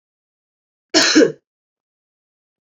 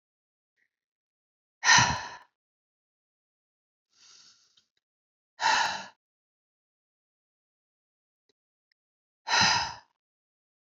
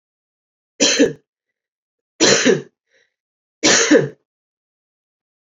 cough_length: 2.6 s
cough_amplitude: 32768
cough_signal_mean_std_ratio: 0.29
exhalation_length: 10.7 s
exhalation_amplitude: 15277
exhalation_signal_mean_std_ratio: 0.25
three_cough_length: 5.5 s
three_cough_amplitude: 28950
three_cough_signal_mean_std_ratio: 0.36
survey_phase: beta (2021-08-13 to 2022-03-07)
age: 18-44
gender: Female
wearing_mask: 'No'
symptom_cough_any: true
symptom_runny_or_blocked_nose: true
symptom_fatigue: true
symptom_headache: true
smoker_status: Never smoked
respiratory_condition_asthma: false
respiratory_condition_other: false
recruitment_source: Test and Trace
submission_delay: 2 days
covid_test_result: Positive
covid_test_method: RT-qPCR
covid_ct_value: 18.0
covid_ct_gene: ORF1ab gene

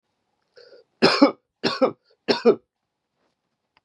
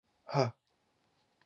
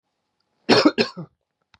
three_cough_length: 3.8 s
three_cough_amplitude: 27336
three_cough_signal_mean_std_ratio: 0.31
exhalation_length: 1.5 s
exhalation_amplitude: 7016
exhalation_signal_mean_std_ratio: 0.26
cough_length: 1.8 s
cough_amplitude: 26989
cough_signal_mean_std_ratio: 0.33
survey_phase: beta (2021-08-13 to 2022-03-07)
age: 45-64
gender: Male
wearing_mask: 'No'
symptom_none: true
smoker_status: Never smoked
respiratory_condition_asthma: false
respiratory_condition_other: false
recruitment_source: REACT
submission_delay: 1 day
covid_test_result: Negative
covid_test_method: RT-qPCR
influenza_a_test_result: Negative
influenza_b_test_result: Negative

